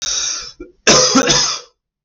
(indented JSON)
{
  "cough_length": "2.0 s",
  "cough_amplitude": 32768,
  "cough_signal_mean_std_ratio": 0.63,
  "survey_phase": "beta (2021-08-13 to 2022-03-07)",
  "age": "18-44",
  "gender": "Male",
  "wearing_mask": "No",
  "symptom_cough_any": true,
  "symptom_runny_or_blocked_nose": true,
  "symptom_sore_throat": true,
  "symptom_headache": true,
  "symptom_onset": "8 days",
  "smoker_status": "Never smoked",
  "respiratory_condition_asthma": false,
  "respiratory_condition_other": false,
  "recruitment_source": "Test and Trace",
  "submission_delay": "2 days",
  "covid_test_result": "Positive",
  "covid_test_method": "RT-qPCR",
  "covid_ct_value": 30.6,
  "covid_ct_gene": "N gene",
  "covid_ct_mean": 31.2,
  "covid_viral_load": "57 copies/ml",
  "covid_viral_load_category": "Minimal viral load (< 10K copies/ml)"
}